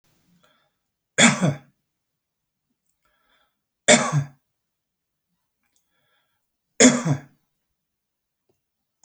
{
  "three_cough_length": "9.0 s",
  "three_cough_amplitude": 30968,
  "three_cough_signal_mean_std_ratio": 0.24,
  "survey_phase": "beta (2021-08-13 to 2022-03-07)",
  "age": "65+",
  "gender": "Male",
  "wearing_mask": "No",
  "symptom_none": true,
  "smoker_status": "Ex-smoker",
  "respiratory_condition_asthma": false,
  "respiratory_condition_other": false,
  "recruitment_source": "REACT",
  "submission_delay": "2 days",
  "covid_test_result": "Negative",
  "covid_test_method": "RT-qPCR"
}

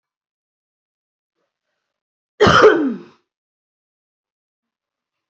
{
  "cough_length": "5.3 s",
  "cough_amplitude": 32767,
  "cough_signal_mean_std_ratio": 0.25,
  "survey_phase": "beta (2021-08-13 to 2022-03-07)",
  "age": "18-44",
  "gender": "Female",
  "wearing_mask": "Yes",
  "symptom_none": true,
  "smoker_status": "Never smoked",
  "respiratory_condition_asthma": false,
  "respiratory_condition_other": false,
  "recruitment_source": "REACT",
  "submission_delay": "1 day",
  "covid_test_result": "Negative",
  "covid_test_method": "RT-qPCR"
}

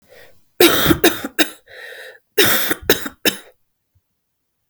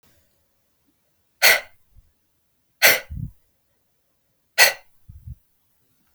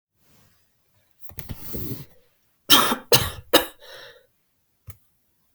{
  "cough_length": "4.7 s",
  "cough_amplitude": 32768,
  "cough_signal_mean_std_ratio": 0.4,
  "exhalation_length": "6.1 s",
  "exhalation_amplitude": 32766,
  "exhalation_signal_mean_std_ratio": 0.23,
  "three_cough_length": "5.5 s",
  "three_cough_amplitude": 32768,
  "three_cough_signal_mean_std_ratio": 0.29,
  "survey_phase": "beta (2021-08-13 to 2022-03-07)",
  "age": "18-44",
  "gender": "Female",
  "wearing_mask": "No",
  "symptom_cough_any": true,
  "symptom_runny_or_blocked_nose": true,
  "symptom_sore_throat": true,
  "symptom_fatigue": true,
  "symptom_fever_high_temperature": true,
  "symptom_headache": true,
  "smoker_status": "Never smoked",
  "respiratory_condition_asthma": false,
  "respiratory_condition_other": false,
  "recruitment_source": "Test and Trace",
  "submission_delay": "-1 day",
  "covid_test_result": "Positive",
  "covid_test_method": "LFT"
}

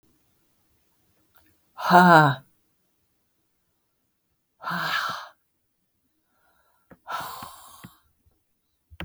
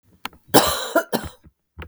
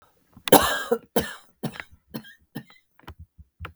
{
  "exhalation_length": "9.0 s",
  "exhalation_amplitude": 31414,
  "exhalation_signal_mean_std_ratio": 0.25,
  "cough_length": "1.9 s",
  "cough_amplitude": 32768,
  "cough_signal_mean_std_ratio": 0.38,
  "three_cough_length": "3.8 s",
  "three_cough_amplitude": 32768,
  "three_cough_signal_mean_std_ratio": 0.28,
  "survey_phase": "beta (2021-08-13 to 2022-03-07)",
  "age": "45-64",
  "gender": "Female",
  "wearing_mask": "No",
  "symptom_cough_any": true,
  "symptom_new_continuous_cough": true,
  "symptom_fatigue": true,
  "symptom_onset": "12 days",
  "smoker_status": "Ex-smoker",
  "respiratory_condition_asthma": false,
  "respiratory_condition_other": false,
  "recruitment_source": "REACT",
  "submission_delay": "1 day",
  "covid_test_result": "Negative",
  "covid_test_method": "RT-qPCR",
  "influenza_a_test_result": "Negative",
  "influenza_b_test_result": "Negative"
}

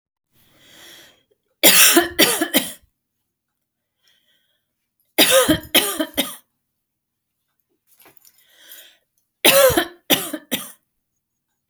{
  "three_cough_length": "11.7 s",
  "three_cough_amplitude": 32768,
  "three_cough_signal_mean_std_ratio": 0.33,
  "survey_phase": "alpha (2021-03-01 to 2021-08-12)",
  "age": "45-64",
  "gender": "Female",
  "wearing_mask": "No",
  "symptom_none": true,
  "smoker_status": "Ex-smoker",
  "respiratory_condition_asthma": false,
  "respiratory_condition_other": false,
  "recruitment_source": "REACT",
  "submission_delay": "2 days",
  "covid_test_result": "Negative",
  "covid_test_method": "RT-qPCR"
}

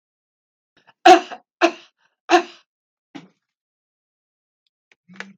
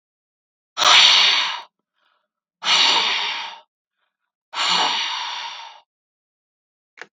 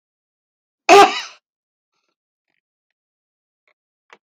{
  "three_cough_length": "5.4 s",
  "three_cough_amplitude": 32768,
  "three_cough_signal_mean_std_ratio": 0.2,
  "exhalation_length": "7.2 s",
  "exhalation_amplitude": 32768,
  "exhalation_signal_mean_std_ratio": 0.45,
  "cough_length": "4.3 s",
  "cough_amplitude": 32768,
  "cough_signal_mean_std_ratio": 0.19,
  "survey_phase": "beta (2021-08-13 to 2022-03-07)",
  "age": "65+",
  "gender": "Female",
  "wearing_mask": "No",
  "symptom_none": true,
  "smoker_status": "Never smoked",
  "respiratory_condition_asthma": false,
  "respiratory_condition_other": false,
  "recruitment_source": "REACT",
  "submission_delay": "2 days",
  "covid_test_result": "Negative",
  "covid_test_method": "RT-qPCR"
}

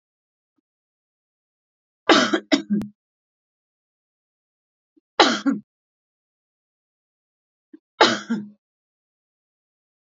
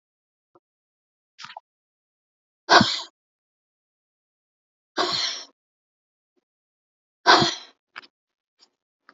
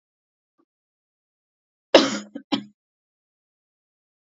{
  "three_cough_length": "10.2 s",
  "three_cough_amplitude": 32767,
  "three_cough_signal_mean_std_ratio": 0.24,
  "exhalation_length": "9.1 s",
  "exhalation_amplitude": 29645,
  "exhalation_signal_mean_std_ratio": 0.22,
  "cough_length": "4.4 s",
  "cough_amplitude": 30695,
  "cough_signal_mean_std_ratio": 0.17,
  "survey_phase": "alpha (2021-03-01 to 2021-08-12)",
  "age": "45-64",
  "gender": "Female",
  "wearing_mask": "No",
  "symptom_none": true,
  "smoker_status": "Ex-smoker",
  "respiratory_condition_asthma": false,
  "respiratory_condition_other": false,
  "recruitment_source": "REACT",
  "submission_delay": "1 day",
  "covid_test_result": "Negative",
  "covid_test_method": "RT-qPCR"
}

